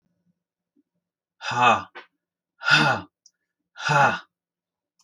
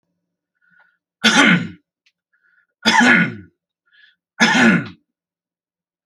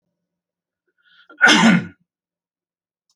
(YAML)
exhalation_length: 5.0 s
exhalation_amplitude: 23089
exhalation_signal_mean_std_ratio: 0.36
three_cough_length: 6.1 s
three_cough_amplitude: 31745
three_cough_signal_mean_std_ratio: 0.39
cough_length: 3.2 s
cough_amplitude: 29115
cough_signal_mean_std_ratio: 0.3
survey_phase: beta (2021-08-13 to 2022-03-07)
age: 45-64
gender: Male
wearing_mask: 'No'
symptom_none: true
smoker_status: Ex-smoker
respiratory_condition_asthma: false
respiratory_condition_other: false
recruitment_source: REACT
submission_delay: 2 days
covid_test_result: Negative
covid_test_method: RT-qPCR